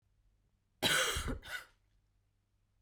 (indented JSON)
{
  "cough_length": "2.8 s",
  "cough_amplitude": 4053,
  "cough_signal_mean_std_ratio": 0.39,
  "survey_phase": "beta (2021-08-13 to 2022-03-07)",
  "age": "18-44",
  "gender": "Female",
  "wearing_mask": "No",
  "symptom_cough_any": true,
  "symptom_runny_or_blocked_nose": true,
  "symptom_fatigue": true,
  "symptom_headache": true,
  "symptom_onset": "3 days",
  "smoker_status": "Ex-smoker",
  "respiratory_condition_asthma": false,
  "respiratory_condition_other": false,
  "recruitment_source": "Test and Trace",
  "submission_delay": "2 days",
  "covid_test_result": "Positive",
  "covid_test_method": "RT-qPCR"
}